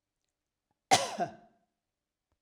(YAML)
cough_length: 2.4 s
cough_amplitude: 12395
cough_signal_mean_std_ratio: 0.24
survey_phase: alpha (2021-03-01 to 2021-08-12)
age: 45-64
gender: Female
wearing_mask: 'No'
symptom_none: true
smoker_status: Never smoked
respiratory_condition_asthma: false
respiratory_condition_other: false
recruitment_source: REACT
submission_delay: 2 days
covid_test_result: Negative
covid_test_method: RT-qPCR